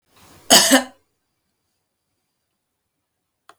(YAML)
cough_length: 3.6 s
cough_amplitude: 32768
cough_signal_mean_std_ratio: 0.23
survey_phase: beta (2021-08-13 to 2022-03-07)
age: 65+
gender: Female
wearing_mask: 'No'
symptom_none: true
smoker_status: Never smoked
respiratory_condition_asthma: false
respiratory_condition_other: false
recruitment_source: REACT
submission_delay: 1 day
covid_test_result: Negative
covid_test_method: RT-qPCR